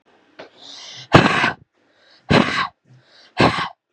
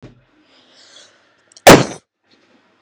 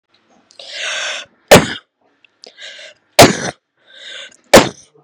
{"exhalation_length": "3.9 s", "exhalation_amplitude": 32768, "exhalation_signal_mean_std_ratio": 0.39, "cough_length": "2.8 s", "cough_amplitude": 32768, "cough_signal_mean_std_ratio": 0.22, "three_cough_length": "5.0 s", "three_cough_amplitude": 32768, "three_cough_signal_mean_std_ratio": 0.3, "survey_phase": "beta (2021-08-13 to 2022-03-07)", "age": "18-44", "gender": "Female", "wearing_mask": "No", "symptom_none": true, "smoker_status": "Never smoked", "respiratory_condition_asthma": true, "respiratory_condition_other": false, "recruitment_source": "REACT", "submission_delay": "1 day", "covid_test_result": "Negative", "covid_test_method": "RT-qPCR", "influenza_a_test_result": "Negative", "influenza_b_test_result": "Negative"}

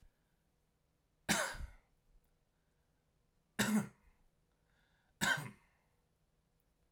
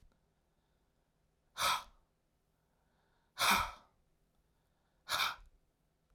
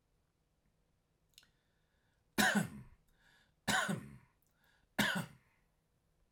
{"cough_length": "6.9 s", "cough_amplitude": 3765, "cough_signal_mean_std_ratio": 0.29, "exhalation_length": "6.1 s", "exhalation_amplitude": 4174, "exhalation_signal_mean_std_ratio": 0.29, "three_cough_length": "6.3 s", "three_cough_amplitude": 4522, "three_cough_signal_mean_std_ratio": 0.31, "survey_phase": "alpha (2021-03-01 to 2021-08-12)", "age": "45-64", "gender": "Male", "wearing_mask": "No", "symptom_none": true, "smoker_status": "Never smoked", "respiratory_condition_asthma": false, "respiratory_condition_other": false, "recruitment_source": "REACT", "submission_delay": "1 day", "covid_test_result": "Negative", "covid_test_method": "RT-qPCR"}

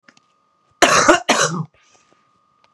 {"cough_length": "2.7 s", "cough_amplitude": 32768, "cough_signal_mean_std_ratio": 0.39, "survey_phase": "beta (2021-08-13 to 2022-03-07)", "age": "45-64", "gender": "Female", "wearing_mask": "No", "symptom_fatigue": true, "symptom_onset": "12 days", "smoker_status": "Never smoked", "respiratory_condition_asthma": false, "respiratory_condition_other": false, "recruitment_source": "REACT", "submission_delay": "1 day", "covid_test_result": "Negative", "covid_test_method": "RT-qPCR", "influenza_a_test_result": "Negative", "influenza_b_test_result": "Negative"}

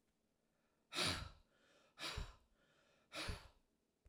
{"exhalation_length": "4.1 s", "exhalation_amplitude": 1317, "exhalation_signal_mean_std_ratio": 0.39, "survey_phase": "alpha (2021-03-01 to 2021-08-12)", "age": "65+", "gender": "Female", "wearing_mask": "No", "symptom_none": true, "smoker_status": "Never smoked", "respiratory_condition_asthma": false, "respiratory_condition_other": false, "recruitment_source": "REACT", "submission_delay": "2 days", "covid_test_result": "Negative", "covid_test_method": "RT-qPCR"}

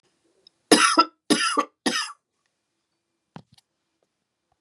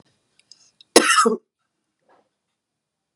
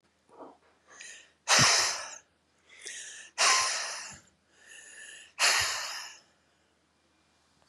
{"three_cough_length": "4.6 s", "three_cough_amplitude": 31958, "three_cough_signal_mean_std_ratio": 0.31, "cough_length": "3.2 s", "cough_amplitude": 32768, "cough_signal_mean_std_ratio": 0.26, "exhalation_length": "7.7 s", "exhalation_amplitude": 10964, "exhalation_signal_mean_std_ratio": 0.4, "survey_phase": "beta (2021-08-13 to 2022-03-07)", "age": "45-64", "gender": "Female", "wearing_mask": "No", "symptom_runny_or_blocked_nose": true, "smoker_status": "Never smoked", "respiratory_condition_asthma": true, "respiratory_condition_other": false, "recruitment_source": "REACT", "submission_delay": "1 day", "covid_test_result": "Negative", "covid_test_method": "RT-qPCR", "influenza_a_test_result": "Negative", "influenza_b_test_result": "Negative"}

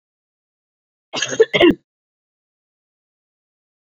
{"cough_length": "3.8 s", "cough_amplitude": 27669, "cough_signal_mean_std_ratio": 0.23, "survey_phase": "beta (2021-08-13 to 2022-03-07)", "age": "45-64", "gender": "Female", "wearing_mask": "No", "symptom_cough_any": true, "symptom_runny_or_blocked_nose": true, "symptom_onset": "6 days", "smoker_status": "Never smoked", "respiratory_condition_asthma": false, "respiratory_condition_other": false, "recruitment_source": "Test and Trace", "submission_delay": "1 day", "covid_test_result": "Positive", "covid_test_method": "RT-qPCR", "covid_ct_value": 15.9, "covid_ct_gene": "ORF1ab gene", "covid_ct_mean": 16.3, "covid_viral_load": "4700000 copies/ml", "covid_viral_load_category": "High viral load (>1M copies/ml)"}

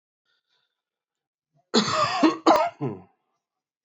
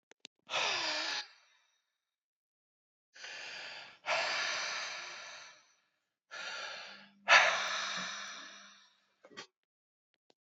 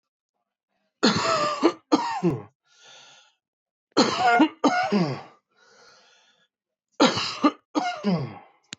{"cough_length": "3.8 s", "cough_amplitude": 18260, "cough_signal_mean_std_ratio": 0.38, "exhalation_length": "10.4 s", "exhalation_amplitude": 11364, "exhalation_signal_mean_std_ratio": 0.41, "three_cough_length": "8.8 s", "three_cough_amplitude": 18864, "three_cough_signal_mean_std_ratio": 0.47, "survey_phase": "beta (2021-08-13 to 2022-03-07)", "age": "18-44", "gender": "Male", "wearing_mask": "No", "symptom_cough_any": true, "symptom_new_continuous_cough": true, "symptom_runny_or_blocked_nose": true, "symptom_shortness_of_breath": true, "symptom_sore_throat": true, "symptom_fatigue": true, "symptom_fever_high_temperature": true, "symptom_headache": true, "symptom_change_to_sense_of_smell_or_taste": true, "symptom_loss_of_taste": true, "symptom_other": true, "symptom_onset": "3 days", "smoker_status": "Never smoked", "respiratory_condition_asthma": true, "respiratory_condition_other": false, "recruitment_source": "Test and Trace", "submission_delay": "2 days", "covid_test_result": "Positive", "covid_test_method": "RT-qPCR", "covid_ct_value": 15.6, "covid_ct_gene": "ORF1ab gene", "covid_ct_mean": 15.9, "covid_viral_load": "6100000 copies/ml", "covid_viral_load_category": "High viral load (>1M copies/ml)"}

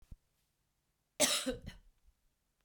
{"cough_length": "2.6 s", "cough_amplitude": 6584, "cough_signal_mean_std_ratio": 0.3, "survey_phase": "beta (2021-08-13 to 2022-03-07)", "age": "45-64", "gender": "Female", "wearing_mask": "No", "symptom_none": true, "symptom_onset": "7 days", "smoker_status": "Ex-smoker", "respiratory_condition_asthma": false, "respiratory_condition_other": false, "recruitment_source": "REACT", "submission_delay": "0 days", "covid_test_result": "Negative", "covid_test_method": "RT-qPCR"}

